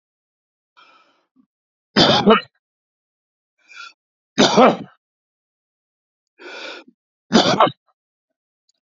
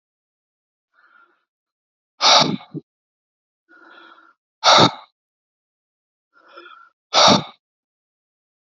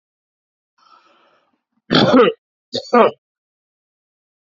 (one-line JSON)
{"three_cough_length": "8.9 s", "three_cough_amplitude": 32768, "three_cough_signal_mean_std_ratio": 0.29, "exhalation_length": "8.7 s", "exhalation_amplitude": 31340, "exhalation_signal_mean_std_ratio": 0.26, "cough_length": "4.5 s", "cough_amplitude": 29332, "cough_signal_mean_std_ratio": 0.3, "survey_phase": "alpha (2021-03-01 to 2021-08-12)", "age": "65+", "gender": "Male", "wearing_mask": "No", "symptom_none": true, "smoker_status": "Ex-smoker", "respiratory_condition_asthma": false, "respiratory_condition_other": false, "recruitment_source": "REACT", "submission_delay": "2 days", "covid_test_result": "Negative", "covid_test_method": "RT-qPCR"}